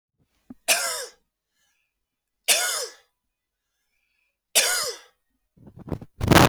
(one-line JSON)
{"three_cough_length": "6.5 s", "three_cough_amplitude": 32766, "three_cough_signal_mean_std_ratio": 0.32, "survey_phase": "beta (2021-08-13 to 2022-03-07)", "age": "45-64", "gender": "Male", "wearing_mask": "No", "symptom_none": true, "smoker_status": "Never smoked", "respiratory_condition_asthma": false, "respiratory_condition_other": false, "recruitment_source": "REACT", "submission_delay": "0 days", "covid_test_result": "Negative", "covid_test_method": "RT-qPCR", "influenza_a_test_result": "Negative", "influenza_b_test_result": "Negative"}